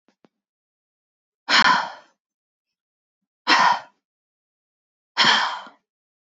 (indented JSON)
{
  "exhalation_length": "6.4 s",
  "exhalation_amplitude": 23421,
  "exhalation_signal_mean_std_ratio": 0.32,
  "survey_phase": "beta (2021-08-13 to 2022-03-07)",
  "age": "18-44",
  "gender": "Female",
  "wearing_mask": "No",
  "symptom_runny_or_blocked_nose": true,
  "symptom_onset": "12 days",
  "smoker_status": "Ex-smoker",
  "respiratory_condition_asthma": false,
  "respiratory_condition_other": false,
  "recruitment_source": "REACT",
  "submission_delay": "1 day",
  "covid_test_result": "Negative",
  "covid_test_method": "RT-qPCR",
  "influenza_a_test_result": "Negative",
  "influenza_b_test_result": "Negative"
}